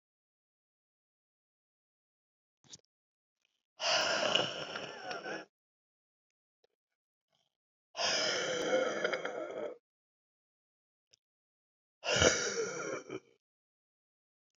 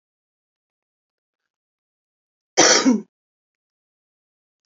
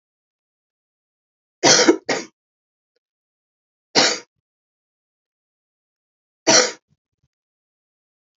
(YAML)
exhalation_length: 14.6 s
exhalation_amplitude: 8555
exhalation_signal_mean_std_ratio: 0.4
cough_length: 4.7 s
cough_amplitude: 32768
cough_signal_mean_std_ratio: 0.23
three_cough_length: 8.4 s
three_cough_amplitude: 32768
three_cough_signal_mean_std_ratio: 0.24
survey_phase: beta (2021-08-13 to 2022-03-07)
age: 65+
gender: Female
wearing_mask: 'No'
symptom_cough_any: true
symptom_shortness_of_breath: true
symptom_fatigue: true
symptom_onset: 3 days
smoker_status: Never smoked
respiratory_condition_asthma: true
respiratory_condition_other: false
recruitment_source: Test and Trace
submission_delay: 1 day
covid_test_result: Positive
covid_test_method: RT-qPCR
covid_ct_value: 21.8
covid_ct_gene: N gene